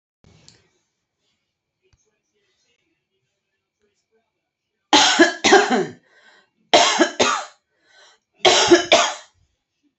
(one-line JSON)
{"three_cough_length": "10.0 s", "three_cough_amplitude": 30701, "three_cough_signal_mean_std_ratio": 0.34, "survey_phase": "beta (2021-08-13 to 2022-03-07)", "age": "65+", "gender": "Female", "wearing_mask": "No", "symptom_none": true, "smoker_status": "Ex-smoker", "respiratory_condition_asthma": false, "respiratory_condition_other": false, "recruitment_source": "REACT", "submission_delay": "2 days", "covid_test_result": "Negative", "covid_test_method": "RT-qPCR", "influenza_a_test_result": "Negative", "influenza_b_test_result": "Negative"}